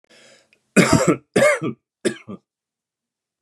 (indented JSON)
{
  "three_cough_length": "3.4 s",
  "three_cough_amplitude": 30805,
  "three_cough_signal_mean_std_ratio": 0.37,
  "survey_phase": "beta (2021-08-13 to 2022-03-07)",
  "age": "18-44",
  "gender": "Male",
  "wearing_mask": "No",
  "symptom_none": true,
  "smoker_status": "Never smoked",
  "respiratory_condition_asthma": false,
  "respiratory_condition_other": false,
  "recruitment_source": "REACT",
  "submission_delay": "4 days",
  "covid_test_method": "RT-qPCR",
  "influenza_a_test_result": "Unknown/Void",
  "influenza_b_test_result": "Unknown/Void"
}